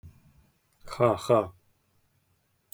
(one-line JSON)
{"exhalation_length": "2.7 s", "exhalation_amplitude": 15069, "exhalation_signal_mean_std_ratio": 0.3, "survey_phase": "beta (2021-08-13 to 2022-03-07)", "age": "18-44", "gender": "Male", "wearing_mask": "Prefer not to say", "symptom_none": true, "smoker_status": "Never smoked", "respiratory_condition_asthma": false, "respiratory_condition_other": false, "recruitment_source": "REACT", "submission_delay": "5 days", "covid_test_result": "Negative", "covid_test_method": "RT-qPCR", "influenza_a_test_result": "Negative", "influenza_b_test_result": "Negative"}